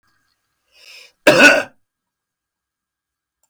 {"cough_length": "3.5 s", "cough_amplitude": 32768, "cough_signal_mean_std_ratio": 0.26, "survey_phase": "beta (2021-08-13 to 2022-03-07)", "age": "65+", "gender": "Male", "wearing_mask": "No", "symptom_none": true, "smoker_status": "Ex-smoker", "respiratory_condition_asthma": false, "respiratory_condition_other": false, "recruitment_source": "REACT", "submission_delay": "3 days", "covid_test_result": "Negative", "covid_test_method": "RT-qPCR"}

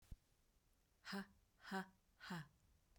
{"exhalation_length": "3.0 s", "exhalation_amplitude": 654, "exhalation_signal_mean_std_ratio": 0.42, "survey_phase": "beta (2021-08-13 to 2022-03-07)", "age": "45-64", "gender": "Female", "wearing_mask": "No", "symptom_none": true, "smoker_status": "Ex-smoker", "respiratory_condition_asthma": false, "respiratory_condition_other": false, "recruitment_source": "REACT", "submission_delay": "1 day", "covid_test_result": "Negative", "covid_test_method": "RT-qPCR"}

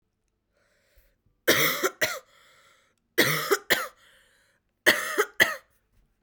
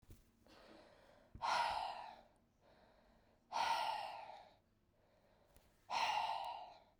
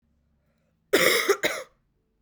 {"three_cough_length": "6.2 s", "three_cough_amplitude": 25184, "three_cough_signal_mean_std_ratio": 0.37, "exhalation_length": "7.0 s", "exhalation_amplitude": 1434, "exhalation_signal_mean_std_ratio": 0.5, "cough_length": "2.2 s", "cough_amplitude": 18837, "cough_signal_mean_std_ratio": 0.4, "survey_phase": "beta (2021-08-13 to 2022-03-07)", "age": "18-44", "gender": "Female", "wearing_mask": "No", "symptom_cough_any": true, "symptom_runny_or_blocked_nose": true, "symptom_sore_throat": true, "symptom_fatigue": true, "symptom_onset": "5 days", "smoker_status": "Never smoked", "respiratory_condition_asthma": false, "respiratory_condition_other": false, "recruitment_source": "Test and Trace", "submission_delay": "1 day", "covid_test_result": "Positive", "covid_test_method": "ePCR"}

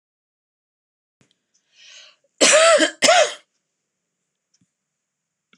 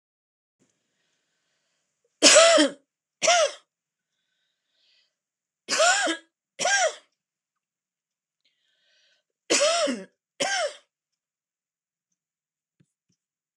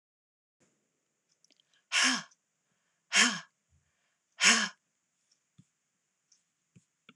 {"cough_length": "5.6 s", "cough_amplitude": 26028, "cough_signal_mean_std_ratio": 0.3, "three_cough_length": "13.6 s", "three_cough_amplitude": 25511, "three_cough_signal_mean_std_ratio": 0.31, "exhalation_length": "7.2 s", "exhalation_amplitude": 12697, "exhalation_signal_mean_std_ratio": 0.25, "survey_phase": "alpha (2021-03-01 to 2021-08-12)", "age": "45-64", "gender": "Female", "wearing_mask": "No", "symptom_none": true, "smoker_status": "Never smoked", "respiratory_condition_asthma": false, "respiratory_condition_other": false, "recruitment_source": "REACT", "submission_delay": "2 days", "covid_test_result": "Negative", "covid_test_method": "RT-qPCR"}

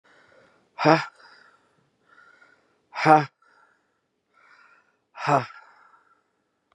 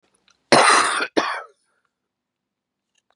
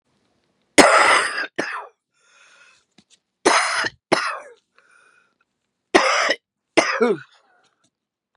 {"exhalation_length": "6.7 s", "exhalation_amplitude": 30516, "exhalation_signal_mean_std_ratio": 0.23, "cough_length": "3.2 s", "cough_amplitude": 31520, "cough_signal_mean_std_ratio": 0.36, "three_cough_length": "8.4 s", "three_cough_amplitude": 32768, "three_cough_signal_mean_std_ratio": 0.38, "survey_phase": "beta (2021-08-13 to 2022-03-07)", "age": "45-64", "gender": "Female", "wearing_mask": "No", "symptom_cough_any": true, "symptom_shortness_of_breath": true, "symptom_sore_throat": true, "symptom_abdominal_pain": true, "symptom_fatigue": true, "symptom_headache": true, "smoker_status": "Current smoker (1 to 10 cigarettes per day)", "respiratory_condition_asthma": true, "respiratory_condition_other": false, "recruitment_source": "Test and Trace", "submission_delay": "2 days", "covid_test_result": "Positive", "covid_test_method": "LAMP"}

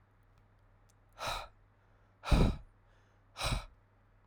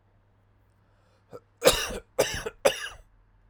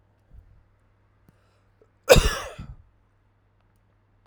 {"exhalation_length": "4.3 s", "exhalation_amplitude": 6897, "exhalation_signal_mean_std_ratio": 0.31, "three_cough_length": "3.5 s", "three_cough_amplitude": 19751, "three_cough_signal_mean_std_ratio": 0.32, "cough_length": "4.3 s", "cough_amplitude": 32768, "cough_signal_mean_std_ratio": 0.2, "survey_phase": "alpha (2021-03-01 to 2021-08-12)", "age": "18-44", "gender": "Male", "wearing_mask": "No", "symptom_cough_any": true, "symptom_fatigue": true, "symptom_fever_high_temperature": true, "symptom_change_to_sense_of_smell_or_taste": true, "symptom_loss_of_taste": true, "symptom_onset": "5 days", "smoker_status": "Never smoked", "respiratory_condition_asthma": false, "respiratory_condition_other": false, "recruitment_source": "Test and Trace", "submission_delay": "2 days", "covid_test_result": "Positive", "covid_test_method": "RT-qPCR", "covid_ct_value": 14.1, "covid_ct_gene": "N gene", "covid_ct_mean": 14.8, "covid_viral_load": "14000000 copies/ml", "covid_viral_load_category": "High viral load (>1M copies/ml)"}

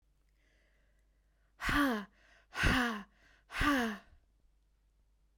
{"exhalation_length": "5.4 s", "exhalation_amplitude": 4621, "exhalation_signal_mean_std_ratio": 0.41, "survey_phase": "beta (2021-08-13 to 2022-03-07)", "age": "45-64", "gender": "Female", "wearing_mask": "No", "symptom_none": true, "smoker_status": "Ex-smoker", "respiratory_condition_asthma": false, "respiratory_condition_other": false, "recruitment_source": "REACT", "submission_delay": "2 days", "covid_test_result": "Negative", "covid_test_method": "RT-qPCR"}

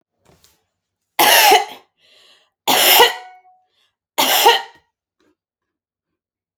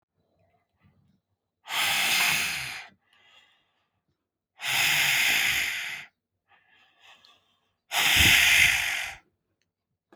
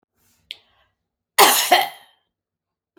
{"three_cough_length": "6.6 s", "three_cough_amplitude": 32768, "three_cough_signal_mean_std_ratio": 0.37, "exhalation_length": "10.2 s", "exhalation_amplitude": 15797, "exhalation_signal_mean_std_ratio": 0.48, "cough_length": "3.0 s", "cough_amplitude": 32768, "cough_signal_mean_std_ratio": 0.3, "survey_phase": "beta (2021-08-13 to 2022-03-07)", "age": "45-64", "gender": "Female", "wearing_mask": "No", "symptom_none": true, "smoker_status": "Never smoked", "respiratory_condition_asthma": false, "respiratory_condition_other": false, "recruitment_source": "REACT", "submission_delay": "1 day", "covid_test_result": "Negative", "covid_test_method": "RT-qPCR"}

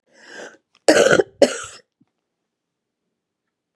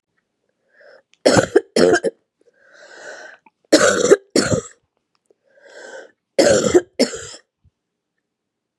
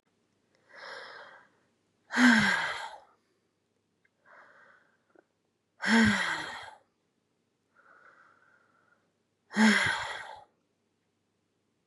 {"cough_length": "3.8 s", "cough_amplitude": 32768, "cough_signal_mean_std_ratio": 0.27, "three_cough_length": "8.8 s", "three_cough_amplitude": 32768, "three_cough_signal_mean_std_ratio": 0.36, "exhalation_length": "11.9 s", "exhalation_amplitude": 10974, "exhalation_signal_mean_std_ratio": 0.32, "survey_phase": "beta (2021-08-13 to 2022-03-07)", "age": "45-64", "gender": "Female", "wearing_mask": "No", "symptom_cough_any": true, "symptom_runny_or_blocked_nose": true, "symptom_fatigue": true, "symptom_onset": "2 days", "smoker_status": "Never smoked", "respiratory_condition_asthma": false, "respiratory_condition_other": false, "recruitment_source": "Test and Trace", "submission_delay": "2 days", "covid_test_result": "Positive", "covid_test_method": "ePCR"}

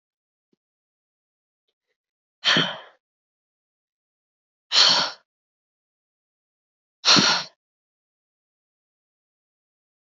{"exhalation_length": "10.2 s", "exhalation_amplitude": 25213, "exhalation_signal_mean_std_ratio": 0.24, "survey_phase": "beta (2021-08-13 to 2022-03-07)", "age": "18-44", "gender": "Female", "wearing_mask": "No", "symptom_cough_any": true, "symptom_runny_or_blocked_nose": true, "symptom_abdominal_pain": true, "symptom_fatigue": true, "symptom_fever_high_temperature": true, "symptom_onset": "3 days", "smoker_status": "Never smoked", "respiratory_condition_asthma": true, "respiratory_condition_other": false, "recruitment_source": "Test and Trace", "submission_delay": "2 days", "covid_test_result": "Positive", "covid_test_method": "RT-qPCR", "covid_ct_value": 18.5, "covid_ct_gene": "ORF1ab gene", "covid_ct_mean": 18.7, "covid_viral_load": "710000 copies/ml", "covid_viral_load_category": "Low viral load (10K-1M copies/ml)"}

